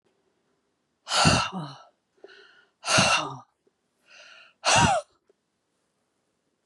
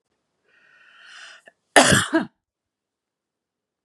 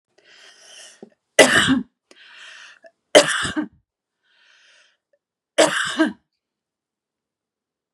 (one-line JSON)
{"exhalation_length": "6.7 s", "exhalation_amplitude": 15738, "exhalation_signal_mean_std_ratio": 0.36, "cough_length": "3.8 s", "cough_amplitude": 32767, "cough_signal_mean_std_ratio": 0.25, "three_cough_length": "7.9 s", "three_cough_amplitude": 32768, "three_cough_signal_mean_std_ratio": 0.29, "survey_phase": "beta (2021-08-13 to 2022-03-07)", "age": "45-64", "gender": "Female", "wearing_mask": "No", "symptom_none": true, "smoker_status": "Never smoked", "respiratory_condition_asthma": false, "respiratory_condition_other": false, "recruitment_source": "REACT", "submission_delay": "2 days", "covid_test_result": "Negative", "covid_test_method": "RT-qPCR", "influenza_a_test_result": "Negative", "influenza_b_test_result": "Negative"}